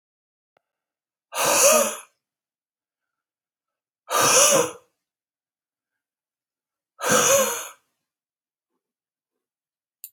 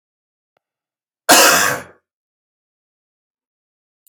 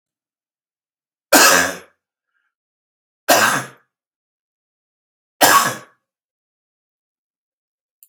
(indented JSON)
{
  "exhalation_length": "10.1 s",
  "exhalation_amplitude": 22884,
  "exhalation_signal_mean_std_ratio": 0.33,
  "cough_length": "4.1 s",
  "cough_amplitude": 32768,
  "cough_signal_mean_std_ratio": 0.27,
  "three_cough_length": "8.1 s",
  "three_cough_amplitude": 32768,
  "three_cough_signal_mean_std_ratio": 0.28,
  "survey_phase": "beta (2021-08-13 to 2022-03-07)",
  "age": "65+",
  "gender": "Male",
  "wearing_mask": "No",
  "symptom_none": true,
  "smoker_status": "Ex-smoker",
  "respiratory_condition_asthma": false,
  "respiratory_condition_other": false,
  "recruitment_source": "REACT",
  "submission_delay": "0 days",
  "covid_test_result": "Negative",
  "covid_test_method": "RT-qPCR",
  "influenza_a_test_result": "Negative",
  "influenza_b_test_result": "Negative"
}